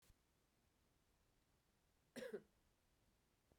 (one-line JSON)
{"cough_length": "3.6 s", "cough_amplitude": 311, "cough_signal_mean_std_ratio": 0.3, "survey_phase": "beta (2021-08-13 to 2022-03-07)", "age": "45-64", "gender": "Female", "wearing_mask": "No", "symptom_cough_any": true, "symptom_runny_or_blocked_nose": true, "symptom_shortness_of_breath": true, "symptom_fatigue": true, "symptom_fever_high_temperature": true, "symptom_headache": true, "symptom_change_to_sense_of_smell_or_taste": true, "symptom_onset": "3 days", "smoker_status": "Ex-smoker", "respiratory_condition_asthma": true, "respiratory_condition_other": false, "recruitment_source": "Test and Trace", "submission_delay": "1 day", "covid_test_result": "Positive", "covid_test_method": "ePCR"}